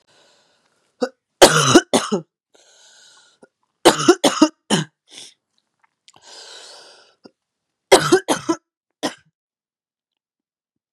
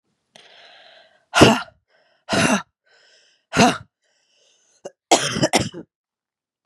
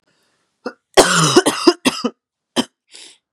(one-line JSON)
{"three_cough_length": "10.9 s", "three_cough_amplitude": 32768, "three_cough_signal_mean_std_ratio": 0.28, "exhalation_length": "6.7 s", "exhalation_amplitude": 32768, "exhalation_signal_mean_std_ratio": 0.32, "cough_length": "3.3 s", "cough_amplitude": 32768, "cough_signal_mean_std_ratio": 0.39, "survey_phase": "beta (2021-08-13 to 2022-03-07)", "age": "18-44", "gender": "Female", "wearing_mask": "No", "symptom_cough_any": true, "symptom_new_continuous_cough": true, "symptom_sore_throat": true, "symptom_onset": "9 days", "smoker_status": "Current smoker (1 to 10 cigarettes per day)", "respiratory_condition_asthma": false, "respiratory_condition_other": false, "recruitment_source": "Test and Trace", "submission_delay": "1 day", "covid_test_result": "Positive", "covid_test_method": "RT-qPCR", "covid_ct_value": 19.7, "covid_ct_gene": "N gene"}